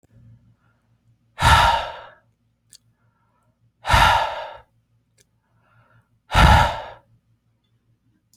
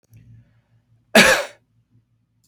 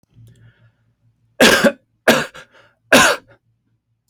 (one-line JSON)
{"exhalation_length": "8.4 s", "exhalation_amplitude": 26423, "exhalation_signal_mean_std_ratio": 0.33, "cough_length": "2.5 s", "cough_amplitude": 30962, "cough_signal_mean_std_ratio": 0.27, "three_cough_length": "4.1 s", "three_cough_amplitude": 30037, "three_cough_signal_mean_std_ratio": 0.35, "survey_phase": "beta (2021-08-13 to 2022-03-07)", "age": "18-44", "gender": "Male", "wearing_mask": "No", "symptom_none": true, "smoker_status": "Never smoked", "respiratory_condition_asthma": false, "respiratory_condition_other": false, "recruitment_source": "REACT", "submission_delay": "1 day", "covid_test_result": "Negative", "covid_test_method": "RT-qPCR"}